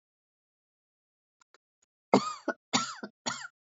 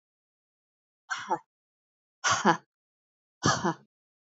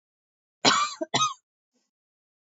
{"three_cough_length": "3.8 s", "three_cough_amplitude": 17274, "three_cough_signal_mean_std_ratio": 0.25, "exhalation_length": "4.3 s", "exhalation_amplitude": 15622, "exhalation_signal_mean_std_ratio": 0.3, "cough_length": "2.5 s", "cough_amplitude": 22881, "cough_signal_mean_std_ratio": 0.34, "survey_phase": "beta (2021-08-13 to 2022-03-07)", "age": "18-44", "gender": "Female", "wearing_mask": "No", "symptom_cough_any": true, "symptom_runny_or_blocked_nose": true, "symptom_sore_throat": true, "symptom_onset": "13 days", "smoker_status": "Never smoked", "respiratory_condition_asthma": false, "respiratory_condition_other": false, "recruitment_source": "REACT", "submission_delay": "2 days", "covid_test_result": "Negative", "covid_test_method": "RT-qPCR"}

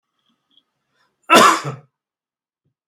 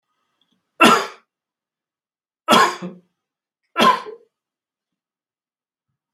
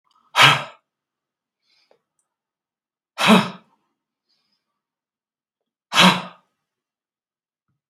{"cough_length": "2.9 s", "cough_amplitude": 32768, "cough_signal_mean_std_ratio": 0.27, "three_cough_length": "6.1 s", "three_cough_amplitude": 32768, "three_cough_signal_mean_std_ratio": 0.27, "exhalation_length": "7.9 s", "exhalation_amplitude": 32767, "exhalation_signal_mean_std_ratio": 0.24, "survey_phase": "beta (2021-08-13 to 2022-03-07)", "age": "65+", "gender": "Male", "wearing_mask": "No", "symptom_none": true, "smoker_status": "Never smoked", "respiratory_condition_asthma": false, "respiratory_condition_other": false, "recruitment_source": "REACT", "submission_delay": "2 days", "covid_test_result": "Negative", "covid_test_method": "RT-qPCR", "influenza_a_test_result": "Negative", "influenza_b_test_result": "Negative"}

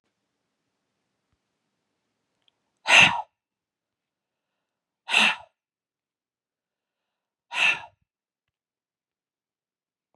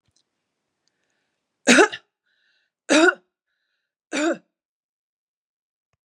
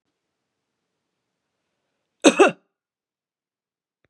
{"exhalation_length": "10.2 s", "exhalation_amplitude": 28285, "exhalation_signal_mean_std_ratio": 0.2, "three_cough_length": "6.1 s", "three_cough_amplitude": 32767, "three_cough_signal_mean_std_ratio": 0.25, "cough_length": "4.1 s", "cough_amplitude": 32504, "cough_signal_mean_std_ratio": 0.17, "survey_phase": "beta (2021-08-13 to 2022-03-07)", "age": "45-64", "gender": "Female", "wearing_mask": "No", "symptom_none": true, "smoker_status": "Ex-smoker", "respiratory_condition_asthma": false, "respiratory_condition_other": false, "recruitment_source": "REACT", "submission_delay": "1 day", "covid_test_method": "RT-qPCR", "influenza_a_test_result": "Unknown/Void", "influenza_b_test_result": "Unknown/Void"}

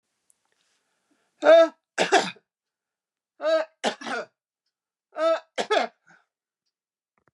{"three_cough_length": "7.3 s", "three_cough_amplitude": 19268, "three_cough_signal_mean_std_ratio": 0.32, "survey_phase": "beta (2021-08-13 to 2022-03-07)", "age": "65+", "gender": "Female", "wearing_mask": "No", "symptom_none": true, "smoker_status": "Ex-smoker", "respiratory_condition_asthma": false, "respiratory_condition_other": false, "recruitment_source": "REACT", "submission_delay": "1 day", "covid_test_result": "Negative", "covid_test_method": "RT-qPCR", "influenza_a_test_result": "Negative", "influenza_b_test_result": "Negative"}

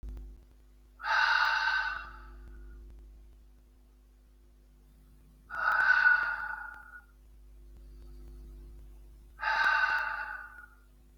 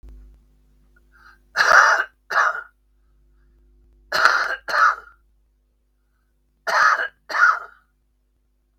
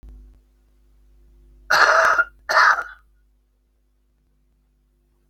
{"exhalation_length": "11.2 s", "exhalation_amplitude": 7075, "exhalation_signal_mean_std_ratio": 0.51, "three_cough_length": "8.8 s", "three_cough_amplitude": 32768, "three_cough_signal_mean_std_ratio": 0.39, "cough_length": "5.3 s", "cough_amplitude": 32767, "cough_signal_mean_std_ratio": 0.34, "survey_phase": "beta (2021-08-13 to 2022-03-07)", "age": "65+", "gender": "Male", "wearing_mask": "No", "symptom_cough_any": true, "smoker_status": "Current smoker (11 or more cigarettes per day)", "respiratory_condition_asthma": false, "respiratory_condition_other": false, "recruitment_source": "REACT", "submission_delay": "3 days", "covid_test_result": "Negative", "covid_test_method": "RT-qPCR", "influenza_a_test_result": "Unknown/Void", "influenza_b_test_result": "Unknown/Void"}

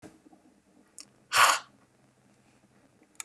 {"exhalation_length": "3.2 s", "exhalation_amplitude": 14962, "exhalation_signal_mean_std_ratio": 0.24, "survey_phase": "beta (2021-08-13 to 2022-03-07)", "age": "45-64", "gender": "Female", "wearing_mask": "No", "symptom_runny_or_blocked_nose": true, "symptom_headache": true, "smoker_status": "Never smoked", "respiratory_condition_asthma": false, "respiratory_condition_other": false, "recruitment_source": "REACT", "submission_delay": "1 day", "covid_test_result": "Negative", "covid_test_method": "RT-qPCR", "influenza_a_test_result": "Negative", "influenza_b_test_result": "Negative"}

